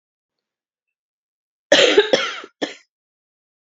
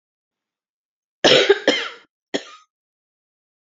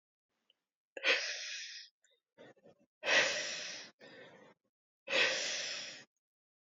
{"cough_length": "3.8 s", "cough_amplitude": 29492, "cough_signal_mean_std_ratio": 0.29, "three_cough_length": "3.7 s", "three_cough_amplitude": 29919, "three_cough_signal_mean_std_ratio": 0.29, "exhalation_length": "6.7 s", "exhalation_amplitude": 5492, "exhalation_signal_mean_std_ratio": 0.43, "survey_phase": "beta (2021-08-13 to 2022-03-07)", "age": "18-44", "gender": "Female", "wearing_mask": "No", "symptom_cough_any": true, "symptom_new_continuous_cough": true, "symptom_runny_or_blocked_nose": true, "symptom_sore_throat": true, "symptom_abdominal_pain": true, "symptom_fatigue": true, "symptom_fever_high_temperature": true, "symptom_headache": true, "symptom_change_to_sense_of_smell_or_taste": true, "symptom_loss_of_taste": true, "symptom_onset": "2 days", "smoker_status": "Ex-smoker", "respiratory_condition_asthma": false, "respiratory_condition_other": false, "recruitment_source": "Test and Trace", "submission_delay": "2 days", "covid_test_result": "Positive", "covid_test_method": "RT-qPCR", "covid_ct_value": 21.1, "covid_ct_gene": "ORF1ab gene"}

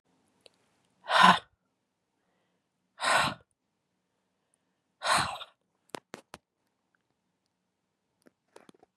{"exhalation_length": "9.0 s", "exhalation_amplitude": 17902, "exhalation_signal_mean_std_ratio": 0.23, "survey_phase": "beta (2021-08-13 to 2022-03-07)", "age": "45-64", "gender": "Female", "wearing_mask": "No", "symptom_none": true, "smoker_status": "Never smoked", "respiratory_condition_asthma": false, "respiratory_condition_other": false, "recruitment_source": "REACT", "submission_delay": "2 days", "covid_test_result": "Negative", "covid_test_method": "RT-qPCR", "influenza_a_test_result": "Negative", "influenza_b_test_result": "Negative"}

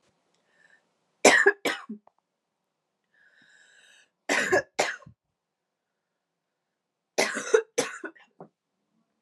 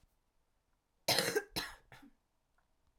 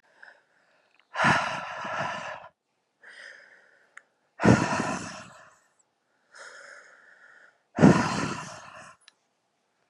{"three_cough_length": "9.2 s", "three_cough_amplitude": 28610, "three_cough_signal_mean_std_ratio": 0.27, "cough_length": "3.0 s", "cough_amplitude": 6689, "cough_signal_mean_std_ratio": 0.31, "exhalation_length": "9.9 s", "exhalation_amplitude": 26753, "exhalation_signal_mean_std_ratio": 0.33, "survey_phase": "alpha (2021-03-01 to 2021-08-12)", "age": "18-44", "gender": "Female", "wearing_mask": "No", "symptom_cough_any": true, "symptom_new_continuous_cough": true, "symptom_fatigue": true, "symptom_fever_high_temperature": true, "symptom_onset": "2 days", "smoker_status": "Never smoked", "respiratory_condition_asthma": false, "respiratory_condition_other": false, "recruitment_source": "Test and Trace", "submission_delay": "1 day", "covid_test_result": "Positive", "covid_test_method": "RT-qPCR", "covid_ct_value": 26.8, "covid_ct_gene": "ORF1ab gene"}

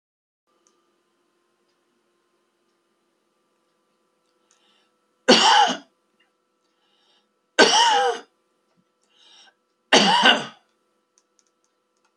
{"three_cough_length": "12.2 s", "three_cough_amplitude": 32247, "three_cough_signal_mean_std_ratio": 0.28, "survey_phase": "beta (2021-08-13 to 2022-03-07)", "age": "65+", "gender": "Male", "wearing_mask": "No", "symptom_none": true, "smoker_status": "Ex-smoker", "respiratory_condition_asthma": false, "respiratory_condition_other": false, "recruitment_source": "REACT", "submission_delay": "2 days", "covid_test_result": "Negative", "covid_test_method": "RT-qPCR", "influenza_a_test_result": "Negative", "influenza_b_test_result": "Negative"}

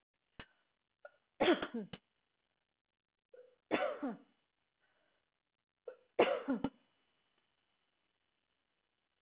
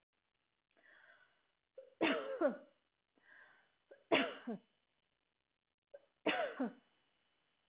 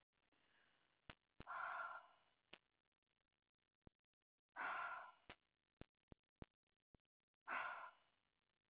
{"cough_length": "9.2 s", "cough_amplitude": 5872, "cough_signal_mean_std_ratio": 0.26, "three_cough_length": "7.7 s", "three_cough_amplitude": 4464, "three_cough_signal_mean_std_ratio": 0.32, "exhalation_length": "8.7 s", "exhalation_amplitude": 504, "exhalation_signal_mean_std_ratio": 0.35, "survey_phase": "alpha (2021-03-01 to 2021-08-12)", "age": "65+", "gender": "Female", "wearing_mask": "No", "symptom_none": true, "smoker_status": "Ex-smoker", "respiratory_condition_asthma": false, "respiratory_condition_other": false, "recruitment_source": "REACT", "submission_delay": "1 day", "covid_test_result": "Negative", "covid_test_method": "RT-qPCR"}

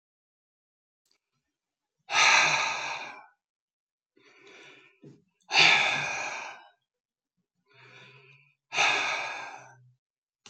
{"exhalation_length": "10.5 s", "exhalation_amplitude": 16074, "exhalation_signal_mean_std_ratio": 0.37, "survey_phase": "alpha (2021-03-01 to 2021-08-12)", "age": "65+", "gender": "Male", "wearing_mask": "No", "symptom_none": true, "smoker_status": "Ex-smoker", "respiratory_condition_asthma": false, "respiratory_condition_other": false, "recruitment_source": "REACT", "submission_delay": "2 days", "covid_test_result": "Negative", "covid_test_method": "RT-qPCR"}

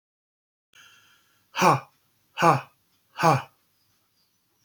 {"exhalation_length": "4.6 s", "exhalation_amplitude": 21672, "exhalation_signal_mean_std_ratio": 0.28, "survey_phase": "alpha (2021-03-01 to 2021-08-12)", "age": "45-64", "gender": "Male", "wearing_mask": "No", "symptom_none": true, "symptom_onset": "12 days", "smoker_status": "Never smoked", "respiratory_condition_asthma": false, "respiratory_condition_other": false, "recruitment_source": "REACT", "submission_delay": "1 day", "covid_test_result": "Negative", "covid_test_method": "RT-qPCR"}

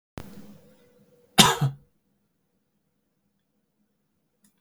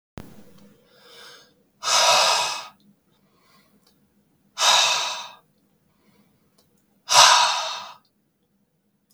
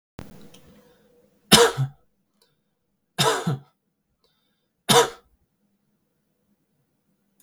{"cough_length": "4.6 s", "cough_amplitude": 32768, "cough_signal_mean_std_ratio": 0.19, "exhalation_length": "9.1 s", "exhalation_amplitude": 32766, "exhalation_signal_mean_std_ratio": 0.37, "three_cough_length": "7.4 s", "three_cough_amplitude": 32768, "three_cough_signal_mean_std_ratio": 0.25, "survey_phase": "beta (2021-08-13 to 2022-03-07)", "age": "18-44", "gender": "Male", "wearing_mask": "No", "symptom_sore_throat": true, "smoker_status": "Never smoked", "respiratory_condition_asthma": false, "respiratory_condition_other": false, "recruitment_source": "Test and Trace", "submission_delay": "2 days", "covid_test_result": "Positive", "covid_test_method": "RT-qPCR", "covid_ct_value": 40.2, "covid_ct_gene": "N gene"}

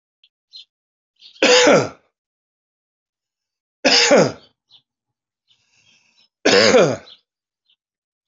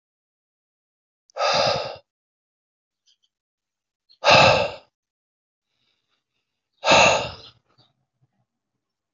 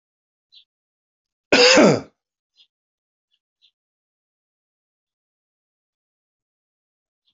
{"three_cough_length": "8.3 s", "three_cough_amplitude": 31821, "three_cough_signal_mean_std_ratio": 0.34, "exhalation_length": "9.1 s", "exhalation_amplitude": 25880, "exhalation_signal_mean_std_ratio": 0.29, "cough_length": "7.3 s", "cough_amplitude": 28181, "cough_signal_mean_std_ratio": 0.2, "survey_phase": "alpha (2021-03-01 to 2021-08-12)", "age": "45-64", "gender": "Male", "wearing_mask": "No", "symptom_none": true, "smoker_status": "Never smoked", "respiratory_condition_asthma": false, "respiratory_condition_other": false, "recruitment_source": "REACT", "submission_delay": "5 days", "covid_test_result": "Negative", "covid_test_method": "RT-qPCR"}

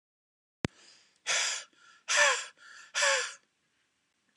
{"exhalation_length": "4.4 s", "exhalation_amplitude": 11885, "exhalation_signal_mean_std_ratio": 0.4, "survey_phase": "alpha (2021-03-01 to 2021-08-12)", "age": "45-64", "gender": "Male", "wearing_mask": "No", "symptom_cough_any": true, "symptom_fatigue": true, "symptom_onset": "2 days", "smoker_status": "Never smoked", "respiratory_condition_asthma": true, "respiratory_condition_other": false, "recruitment_source": "Test and Trace", "submission_delay": "1 day", "covid_test_result": "Positive", "covid_test_method": "RT-qPCR"}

